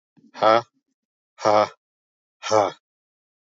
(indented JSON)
{
  "exhalation_length": "3.4 s",
  "exhalation_amplitude": 20927,
  "exhalation_signal_mean_std_ratio": 0.33,
  "survey_phase": "beta (2021-08-13 to 2022-03-07)",
  "age": "45-64",
  "gender": "Male",
  "wearing_mask": "No",
  "symptom_none": true,
  "smoker_status": "Never smoked",
  "respiratory_condition_asthma": false,
  "respiratory_condition_other": false,
  "recruitment_source": "REACT",
  "submission_delay": "3 days",
  "covid_test_result": "Negative",
  "covid_test_method": "RT-qPCR"
}